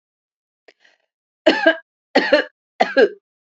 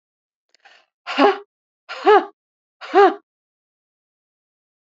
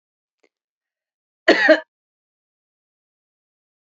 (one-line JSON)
{"three_cough_length": "3.6 s", "three_cough_amplitude": 29698, "three_cough_signal_mean_std_ratio": 0.34, "exhalation_length": "4.9 s", "exhalation_amplitude": 29153, "exhalation_signal_mean_std_ratio": 0.27, "cough_length": "3.9 s", "cough_amplitude": 29158, "cough_signal_mean_std_ratio": 0.2, "survey_phase": "beta (2021-08-13 to 2022-03-07)", "age": "45-64", "gender": "Female", "wearing_mask": "No", "symptom_none": true, "smoker_status": "Ex-smoker", "respiratory_condition_asthma": false, "respiratory_condition_other": false, "recruitment_source": "REACT", "submission_delay": "1 day", "covid_test_result": "Negative", "covid_test_method": "RT-qPCR", "influenza_a_test_result": "Negative", "influenza_b_test_result": "Negative"}